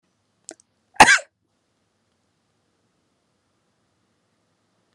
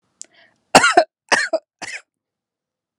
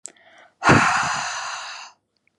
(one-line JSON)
{"cough_length": "4.9 s", "cough_amplitude": 32768, "cough_signal_mean_std_ratio": 0.14, "three_cough_length": "3.0 s", "three_cough_amplitude": 32768, "three_cough_signal_mean_std_ratio": 0.3, "exhalation_length": "2.4 s", "exhalation_amplitude": 28057, "exhalation_signal_mean_std_ratio": 0.48, "survey_phase": "alpha (2021-03-01 to 2021-08-12)", "age": "18-44", "gender": "Female", "wearing_mask": "No", "symptom_fatigue": true, "symptom_headache": true, "symptom_onset": "9 days", "smoker_status": "Never smoked", "respiratory_condition_asthma": false, "respiratory_condition_other": false, "recruitment_source": "REACT", "submission_delay": "2 days", "covid_test_result": "Negative", "covid_test_method": "RT-qPCR"}